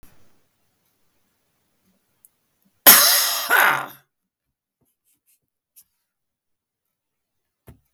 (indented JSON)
{
  "cough_length": "7.9 s",
  "cough_amplitude": 32766,
  "cough_signal_mean_std_ratio": 0.24,
  "survey_phase": "beta (2021-08-13 to 2022-03-07)",
  "age": "65+",
  "gender": "Male",
  "wearing_mask": "No",
  "symptom_none": true,
  "smoker_status": "Never smoked",
  "respiratory_condition_asthma": false,
  "respiratory_condition_other": false,
  "recruitment_source": "REACT",
  "submission_delay": "2 days",
  "covid_test_result": "Negative",
  "covid_test_method": "RT-qPCR",
  "influenza_a_test_result": "Negative",
  "influenza_b_test_result": "Negative"
}